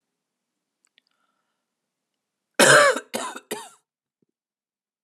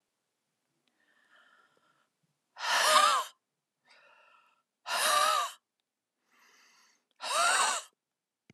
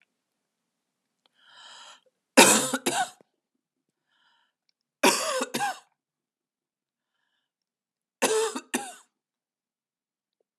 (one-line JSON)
{"cough_length": "5.0 s", "cough_amplitude": 26761, "cough_signal_mean_std_ratio": 0.25, "exhalation_length": "8.5 s", "exhalation_amplitude": 11018, "exhalation_signal_mean_std_ratio": 0.38, "three_cough_length": "10.6 s", "three_cough_amplitude": 30959, "three_cough_signal_mean_std_ratio": 0.27, "survey_phase": "beta (2021-08-13 to 2022-03-07)", "age": "18-44", "gender": "Female", "wearing_mask": "No", "symptom_cough_any": true, "smoker_status": "Never smoked", "respiratory_condition_asthma": false, "respiratory_condition_other": false, "recruitment_source": "REACT", "submission_delay": "1 day", "covid_test_result": "Negative", "covid_test_method": "RT-qPCR", "influenza_a_test_result": "Negative", "influenza_b_test_result": "Negative"}